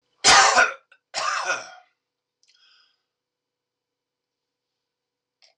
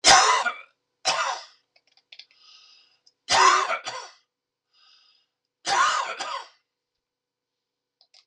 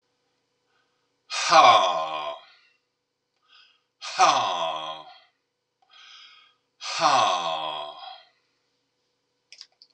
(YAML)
cough_length: 5.6 s
cough_amplitude: 25097
cough_signal_mean_std_ratio: 0.29
three_cough_length: 8.3 s
three_cough_amplitude: 24383
three_cough_signal_mean_std_ratio: 0.37
exhalation_length: 9.9 s
exhalation_amplitude: 23792
exhalation_signal_mean_std_ratio: 0.37
survey_phase: beta (2021-08-13 to 2022-03-07)
age: 65+
gender: Male
wearing_mask: 'No'
symptom_none: true
smoker_status: Never smoked
respiratory_condition_asthma: false
respiratory_condition_other: false
recruitment_source: REACT
submission_delay: 1 day
covid_test_result: Negative
covid_test_method: RT-qPCR
influenza_a_test_result: Negative
influenza_b_test_result: Negative